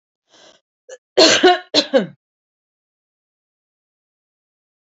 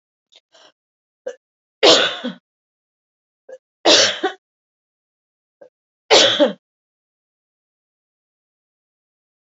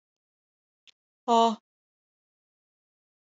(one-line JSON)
{"cough_length": "4.9 s", "cough_amplitude": 32306, "cough_signal_mean_std_ratio": 0.27, "three_cough_length": "9.6 s", "three_cough_amplitude": 31176, "three_cough_signal_mean_std_ratio": 0.27, "exhalation_length": "3.2 s", "exhalation_amplitude": 11476, "exhalation_signal_mean_std_ratio": 0.2, "survey_phase": "alpha (2021-03-01 to 2021-08-12)", "age": "45-64", "gender": "Female", "wearing_mask": "No", "symptom_none": true, "smoker_status": "Never smoked", "respiratory_condition_asthma": false, "respiratory_condition_other": false, "recruitment_source": "REACT", "submission_delay": "3 days", "covid_test_result": "Negative", "covid_test_method": "RT-qPCR"}